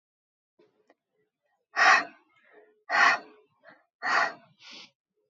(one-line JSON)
{"exhalation_length": "5.3 s", "exhalation_amplitude": 16486, "exhalation_signal_mean_std_ratio": 0.32, "survey_phase": "beta (2021-08-13 to 2022-03-07)", "age": "18-44", "gender": "Female", "wearing_mask": "No", "symptom_runny_or_blocked_nose": true, "symptom_sore_throat": true, "symptom_onset": "4 days", "smoker_status": "Never smoked", "respiratory_condition_asthma": false, "respiratory_condition_other": false, "recruitment_source": "REACT", "submission_delay": "2 days", "covid_test_result": "Negative", "covid_test_method": "RT-qPCR", "influenza_a_test_result": "Negative", "influenza_b_test_result": "Negative"}